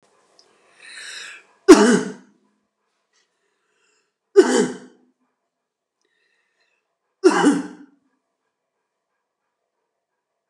{"three_cough_length": "10.5 s", "three_cough_amplitude": 32768, "three_cough_signal_mean_std_ratio": 0.24, "survey_phase": "alpha (2021-03-01 to 2021-08-12)", "age": "45-64", "gender": "Male", "wearing_mask": "No", "symptom_none": true, "smoker_status": "Never smoked", "respiratory_condition_asthma": false, "respiratory_condition_other": false, "recruitment_source": "REACT", "submission_delay": "1 day", "covid_test_result": "Negative", "covid_test_method": "RT-qPCR"}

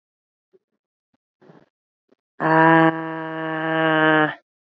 {"exhalation_length": "4.6 s", "exhalation_amplitude": 26049, "exhalation_signal_mean_std_ratio": 0.43, "survey_phase": "beta (2021-08-13 to 2022-03-07)", "age": "18-44", "gender": "Female", "wearing_mask": "No", "symptom_runny_or_blocked_nose": true, "symptom_shortness_of_breath": true, "symptom_headache": true, "symptom_onset": "3 days", "smoker_status": "Never smoked", "respiratory_condition_asthma": false, "respiratory_condition_other": false, "recruitment_source": "Test and Trace", "submission_delay": "1 day", "covid_test_result": "Positive", "covid_test_method": "RT-qPCR", "covid_ct_value": 29.4, "covid_ct_gene": "ORF1ab gene"}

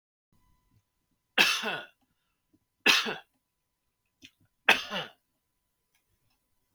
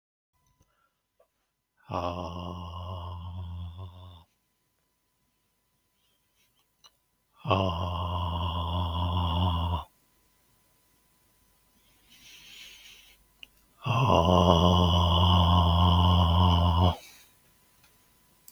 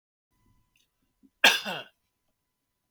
{"three_cough_length": "6.7 s", "three_cough_amplitude": 23589, "three_cough_signal_mean_std_ratio": 0.25, "exhalation_length": "18.5 s", "exhalation_amplitude": 19984, "exhalation_signal_mean_std_ratio": 0.49, "cough_length": "2.9 s", "cough_amplitude": 23699, "cough_signal_mean_std_ratio": 0.2, "survey_phase": "beta (2021-08-13 to 2022-03-07)", "age": "45-64", "gender": "Male", "wearing_mask": "No", "symptom_none": true, "smoker_status": "Ex-smoker", "respiratory_condition_asthma": false, "respiratory_condition_other": false, "recruitment_source": "REACT", "submission_delay": "1 day", "covid_test_result": "Negative", "covid_test_method": "RT-qPCR", "influenza_a_test_result": "Negative", "influenza_b_test_result": "Negative"}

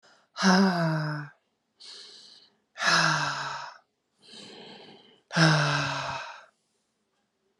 {"exhalation_length": "7.6 s", "exhalation_amplitude": 15072, "exhalation_signal_mean_std_ratio": 0.48, "survey_phase": "alpha (2021-03-01 to 2021-08-12)", "age": "45-64", "gender": "Female", "wearing_mask": "No", "symptom_cough_any": true, "symptom_fatigue": true, "symptom_fever_high_temperature": true, "symptom_onset": "3 days", "smoker_status": "Ex-smoker", "respiratory_condition_asthma": false, "respiratory_condition_other": false, "recruitment_source": "Test and Trace", "submission_delay": "1 day", "covid_test_result": "Positive", "covid_test_method": "RT-qPCR"}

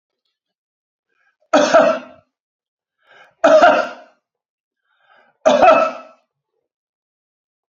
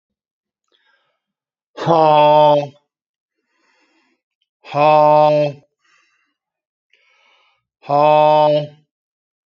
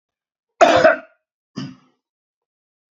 {"three_cough_length": "7.7 s", "three_cough_amplitude": 32767, "three_cough_signal_mean_std_ratio": 0.34, "exhalation_length": "9.5 s", "exhalation_amplitude": 28556, "exhalation_signal_mean_std_ratio": 0.4, "cough_length": "2.9 s", "cough_amplitude": 28967, "cough_signal_mean_std_ratio": 0.29, "survey_phase": "alpha (2021-03-01 to 2021-08-12)", "age": "65+", "gender": "Male", "wearing_mask": "No", "symptom_none": true, "smoker_status": "Ex-smoker", "respiratory_condition_asthma": false, "respiratory_condition_other": false, "recruitment_source": "REACT", "submission_delay": "5 days", "covid_test_result": "Negative", "covid_test_method": "RT-qPCR"}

